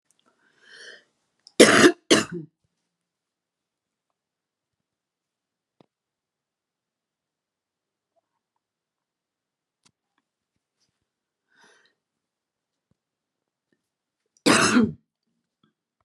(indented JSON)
{
  "cough_length": "16.0 s",
  "cough_amplitude": 32768,
  "cough_signal_mean_std_ratio": 0.18,
  "survey_phase": "beta (2021-08-13 to 2022-03-07)",
  "age": "45-64",
  "gender": "Female",
  "wearing_mask": "No",
  "symptom_none": true,
  "symptom_onset": "12 days",
  "smoker_status": "Never smoked",
  "respiratory_condition_asthma": false,
  "respiratory_condition_other": false,
  "recruitment_source": "REACT",
  "submission_delay": "1 day",
  "covid_test_result": "Negative",
  "covid_test_method": "RT-qPCR"
}